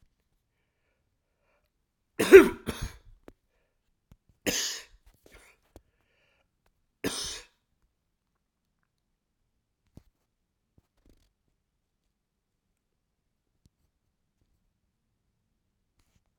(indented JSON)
{
  "three_cough_length": "16.4 s",
  "three_cough_amplitude": 29028,
  "three_cough_signal_mean_std_ratio": 0.12,
  "survey_phase": "beta (2021-08-13 to 2022-03-07)",
  "age": "45-64",
  "gender": "Male",
  "wearing_mask": "No",
  "symptom_none": true,
  "smoker_status": "Never smoked",
  "respiratory_condition_asthma": false,
  "respiratory_condition_other": false,
  "recruitment_source": "REACT",
  "submission_delay": "1 day",
  "covid_test_result": "Negative",
  "covid_test_method": "RT-qPCR"
}